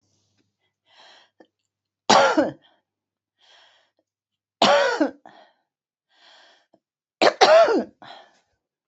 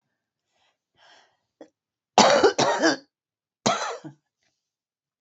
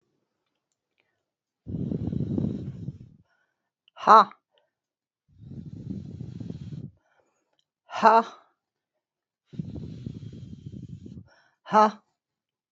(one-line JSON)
{"three_cough_length": "8.9 s", "three_cough_amplitude": 28966, "three_cough_signal_mean_std_ratio": 0.31, "cough_length": "5.2 s", "cough_amplitude": 26826, "cough_signal_mean_std_ratio": 0.33, "exhalation_length": "12.7 s", "exhalation_amplitude": 27094, "exhalation_signal_mean_std_ratio": 0.27, "survey_phase": "beta (2021-08-13 to 2022-03-07)", "age": "65+", "gender": "Female", "wearing_mask": "No", "symptom_new_continuous_cough": true, "symptom_shortness_of_breath": true, "symptom_fatigue": true, "symptom_headache": true, "symptom_onset": "8 days", "smoker_status": "Ex-smoker", "respiratory_condition_asthma": false, "respiratory_condition_other": false, "recruitment_source": "Test and Trace", "submission_delay": "1 day", "covid_test_result": "Positive", "covid_test_method": "RT-qPCR", "covid_ct_value": 31.8, "covid_ct_gene": "ORF1ab gene"}